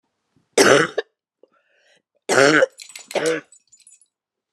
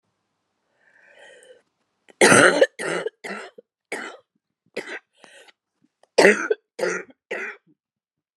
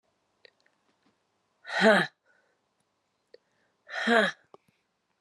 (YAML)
three_cough_length: 4.5 s
three_cough_amplitude: 32022
three_cough_signal_mean_std_ratio: 0.35
cough_length: 8.4 s
cough_amplitude: 32720
cough_signal_mean_std_ratio: 0.3
exhalation_length: 5.2 s
exhalation_amplitude: 15830
exhalation_signal_mean_std_ratio: 0.27
survey_phase: alpha (2021-03-01 to 2021-08-12)
age: 45-64
gender: Female
wearing_mask: 'No'
symptom_cough_any: true
symptom_fatigue: true
symptom_fever_high_temperature: true
symptom_headache: true
symptom_change_to_sense_of_smell_or_taste: true
symptom_loss_of_taste: true
symptom_onset: 2 days
smoker_status: Never smoked
respiratory_condition_asthma: false
respiratory_condition_other: false
recruitment_source: Test and Trace
submission_delay: 2 days
covid_test_result: Positive
covid_test_method: RT-qPCR
covid_ct_value: 25.3
covid_ct_gene: ORF1ab gene